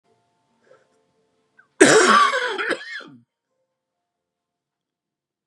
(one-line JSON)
{"cough_length": "5.5 s", "cough_amplitude": 32768, "cough_signal_mean_std_ratio": 0.31, "survey_phase": "beta (2021-08-13 to 2022-03-07)", "age": "45-64", "gender": "Male", "wearing_mask": "No", "symptom_cough_any": true, "symptom_sore_throat": true, "symptom_fatigue": true, "symptom_headache": true, "symptom_change_to_sense_of_smell_or_taste": true, "symptom_onset": "3 days", "smoker_status": "Never smoked", "respiratory_condition_asthma": false, "respiratory_condition_other": false, "recruitment_source": "Test and Trace", "submission_delay": "2 days", "covid_test_result": "Positive", "covid_test_method": "RT-qPCR"}